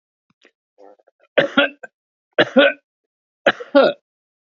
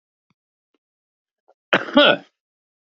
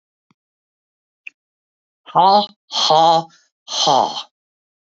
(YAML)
three_cough_length: 4.5 s
three_cough_amplitude: 29262
three_cough_signal_mean_std_ratio: 0.32
cough_length: 3.0 s
cough_amplitude: 32768
cough_signal_mean_std_ratio: 0.24
exhalation_length: 4.9 s
exhalation_amplitude: 28856
exhalation_signal_mean_std_ratio: 0.39
survey_phase: alpha (2021-03-01 to 2021-08-12)
age: 65+
gender: Male
wearing_mask: 'No'
symptom_none: true
smoker_status: Ex-smoker
respiratory_condition_asthma: true
respiratory_condition_other: true
recruitment_source: REACT
submission_delay: 1 day
covid_test_result: Negative
covid_test_method: RT-qPCR